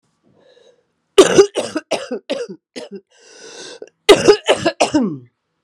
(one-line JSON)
{"cough_length": "5.6 s", "cough_amplitude": 32768, "cough_signal_mean_std_ratio": 0.37, "survey_phase": "beta (2021-08-13 to 2022-03-07)", "age": "65+", "gender": "Female", "wearing_mask": "No", "symptom_cough_any": true, "symptom_new_continuous_cough": true, "symptom_runny_or_blocked_nose": true, "symptom_shortness_of_breath": true, "symptom_fatigue": true, "symptom_headache": true, "symptom_other": true, "symptom_onset": "3 days", "smoker_status": "Ex-smoker", "respiratory_condition_asthma": false, "respiratory_condition_other": false, "recruitment_source": "Test and Trace", "submission_delay": "1 day", "covid_test_result": "Positive", "covid_test_method": "RT-qPCR", "covid_ct_value": 17.8, "covid_ct_gene": "ORF1ab gene", "covid_ct_mean": 18.3, "covid_viral_load": "960000 copies/ml", "covid_viral_load_category": "Low viral load (10K-1M copies/ml)"}